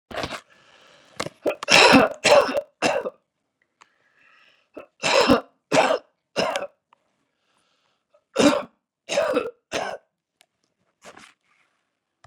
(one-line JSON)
{"three_cough_length": "12.3 s", "three_cough_amplitude": 32243, "three_cough_signal_mean_std_ratio": 0.35, "survey_phase": "beta (2021-08-13 to 2022-03-07)", "age": "65+", "gender": "Male", "wearing_mask": "No", "symptom_none": true, "smoker_status": "Never smoked", "respiratory_condition_asthma": false, "respiratory_condition_other": false, "recruitment_source": "REACT", "submission_delay": "2 days", "covid_test_result": "Negative", "covid_test_method": "RT-qPCR", "influenza_a_test_result": "Unknown/Void", "influenza_b_test_result": "Unknown/Void"}